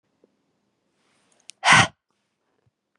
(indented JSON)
{
  "exhalation_length": "3.0 s",
  "exhalation_amplitude": 25449,
  "exhalation_signal_mean_std_ratio": 0.21,
  "survey_phase": "beta (2021-08-13 to 2022-03-07)",
  "age": "18-44",
  "gender": "Female",
  "wearing_mask": "No",
  "symptom_cough_any": true,
  "symptom_runny_or_blocked_nose": true,
  "symptom_sore_throat": true,
  "symptom_onset": "3 days",
  "smoker_status": "Current smoker (1 to 10 cigarettes per day)",
  "respiratory_condition_asthma": false,
  "respiratory_condition_other": false,
  "recruitment_source": "Test and Trace",
  "submission_delay": "1 day",
  "covid_test_result": "Negative",
  "covid_test_method": "RT-qPCR"
}